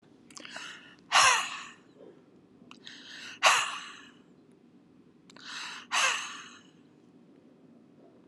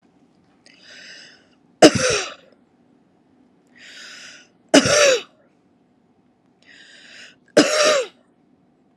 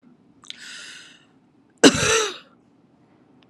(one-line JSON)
{"exhalation_length": "8.3 s", "exhalation_amplitude": 15922, "exhalation_signal_mean_std_ratio": 0.35, "three_cough_length": "9.0 s", "three_cough_amplitude": 32768, "three_cough_signal_mean_std_ratio": 0.3, "cough_length": "3.5 s", "cough_amplitude": 32767, "cough_signal_mean_std_ratio": 0.28, "survey_phase": "alpha (2021-03-01 to 2021-08-12)", "age": "45-64", "gender": "Female", "wearing_mask": "No", "symptom_none": true, "smoker_status": "Ex-smoker", "respiratory_condition_asthma": false, "respiratory_condition_other": false, "recruitment_source": "REACT", "submission_delay": "2 days", "covid_test_result": "Negative", "covid_test_method": "RT-qPCR"}